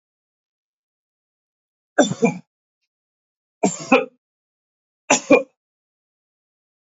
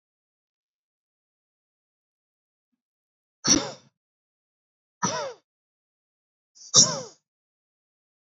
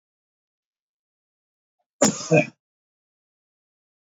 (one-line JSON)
{"three_cough_length": "7.0 s", "three_cough_amplitude": 30375, "three_cough_signal_mean_std_ratio": 0.23, "exhalation_length": "8.3 s", "exhalation_amplitude": 24060, "exhalation_signal_mean_std_ratio": 0.19, "cough_length": "4.1 s", "cough_amplitude": 22954, "cough_signal_mean_std_ratio": 0.2, "survey_phase": "alpha (2021-03-01 to 2021-08-12)", "age": "45-64", "gender": "Male", "wearing_mask": "No", "symptom_none": true, "symptom_onset": "12 days", "smoker_status": "Never smoked", "respiratory_condition_asthma": false, "respiratory_condition_other": false, "recruitment_source": "REACT", "submission_delay": "2 days", "covid_test_result": "Negative", "covid_test_method": "RT-qPCR"}